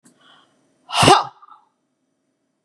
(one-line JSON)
{"exhalation_length": "2.6 s", "exhalation_amplitude": 32768, "exhalation_signal_mean_std_ratio": 0.27, "survey_phase": "beta (2021-08-13 to 2022-03-07)", "age": "65+", "gender": "Female", "wearing_mask": "No", "symptom_none": true, "smoker_status": "Ex-smoker", "respiratory_condition_asthma": false, "respiratory_condition_other": false, "recruitment_source": "REACT", "submission_delay": "2 days", "covid_test_result": "Negative", "covid_test_method": "RT-qPCR", "influenza_a_test_result": "Negative", "influenza_b_test_result": "Negative"}